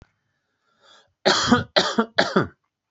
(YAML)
three_cough_length: 2.9 s
three_cough_amplitude: 30916
three_cough_signal_mean_std_ratio: 0.41
survey_phase: beta (2021-08-13 to 2022-03-07)
age: 45-64
gender: Male
wearing_mask: 'No'
symptom_none: true
smoker_status: Never smoked
respiratory_condition_asthma: false
respiratory_condition_other: false
recruitment_source: REACT
submission_delay: 1 day
covid_test_result: Negative
covid_test_method: RT-qPCR